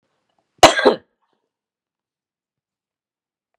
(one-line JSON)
{"exhalation_length": "3.6 s", "exhalation_amplitude": 32768, "exhalation_signal_mean_std_ratio": 0.19, "survey_phase": "beta (2021-08-13 to 2022-03-07)", "age": "45-64", "gender": "Female", "wearing_mask": "No", "symptom_none": true, "smoker_status": "Ex-smoker", "respiratory_condition_asthma": false, "respiratory_condition_other": false, "recruitment_source": "REACT", "submission_delay": "2 days", "covid_test_result": "Negative", "covid_test_method": "RT-qPCR", "influenza_a_test_result": "Unknown/Void", "influenza_b_test_result": "Unknown/Void"}